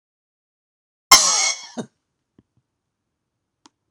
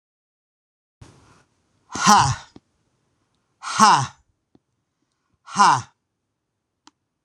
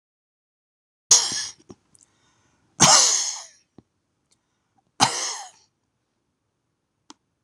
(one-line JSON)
{"cough_length": "3.9 s", "cough_amplitude": 26028, "cough_signal_mean_std_ratio": 0.24, "exhalation_length": "7.2 s", "exhalation_amplitude": 26027, "exhalation_signal_mean_std_ratio": 0.28, "three_cough_length": "7.4 s", "three_cough_amplitude": 26028, "three_cough_signal_mean_std_ratio": 0.28, "survey_phase": "alpha (2021-03-01 to 2021-08-12)", "age": "45-64", "gender": "Male", "wearing_mask": "No", "symptom_none": true, "symptom_onset": "4 days", "smoker_status": "Never smoked", "respiratory_condition_asthma": false, "respiratory_condition_other": false, "recruitment_source": "REACT", "submission_delay": "0 days", "covid_test_result": "Negative", "covid_test_method": "RT-qPCR"}